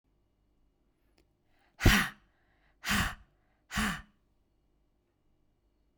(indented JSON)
{
  "exhalation_length": "6.0 s",
  "exhalation_amplitude": 13503,
  "exhalation_signal_mean_std_ratio": 0.26,
  "survey_phase": "beta (2021-08-13 to 2022-03-07)",
  "age": "45-64",
  "gender": "Female",
  "wearing_mask": "No",
  "symptom_change_to_sense_of_smell_or_taste": true,
  "symptom_onset": "12 days",
  "smoker_status": "Never smoked",
  "respiratory_condition_asthma": false,
  "respiratory_condition_other": false,
  "recruitment_source": "REACT",
  "submission_delay": "6 days",
  "covid_test_result": "Negative",
  "covid_test_method": "RT-qPCR",
  "influenza_a_test_result": "Negative",
  "influenza_b_test_result": "Negative"
}